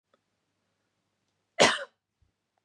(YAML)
cough_length: 2.6 s
cough_amplitude: 18617
cough_signal_mean_std_ratio: 0.19
survey_phase: beta (2021-08-13 to 2022-03-07)
age: 18-44
gender: Female
wearing_mask: 'No'
symptom_none: true
smoker_status: Ex-smoker
respiratory_condition_asthma: false
respiratory_condition_other: false
recruitment_source: REACT
submission_delay: 4 days
covid_test_result: Negative
covid_test_method: RT-qPCR
influenza_a_test_result: Negative
influenza_b_test_result: Negative